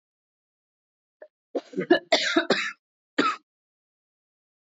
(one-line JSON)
{"three_cough_length": "4.6 s", "three_cough_amplitude": 14703, "three_cough_signal_mean_std_ratio": 0.32, "survey_phase": "beta (2021-08-13 to 2022-03-07)", "age": "18-44", "gender": "Female", "wearing_mask": "No", "symptom_cough_any": true, "symptom_new_continuous_cough": true, "symptom_runny_or_blocked_nose": true, "symptom_sore_throat": true, "symptom_fatigue": true, "symptom_headache": true, "symptom_onset": "12 days", "smoker_status": "Never smoked", "respiratory_condition_asthma": false, "respiratory_condition_other": false, "recruitment_source": "REACT", "submission_delay": "1 day", "covid_test_result": "Negative", "covid_test_method": "RT-qPCR", "influenza_a_test_result": "Unknown/Void", "influenza_b_test_result": "Unknown/Void"}